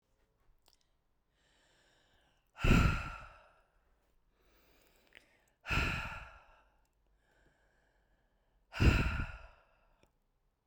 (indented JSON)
{
  "exhalation_length": "10.7 s",
  "exhalation_amplitude": 6874,
  "exhalation_signal_mean_std_ratio": 0.28,
  "survey_phase": "beta (2021-08-13 to 2022-03-07)",
  "age": "45-64",
  "gender": "Female",
  "wearing_mask": "No",
  "symptom_none": true,
  "smoker_status": "Never smoked",
  "respiratory_condition_asthma": false,
  "respiratory_condition_other": false,
  "recruitment_source": "REACT",
  "submission_delay": "1 day",
  "covid_test_result": "Negative",
  "covid_test_method": "RT-qPCR"
}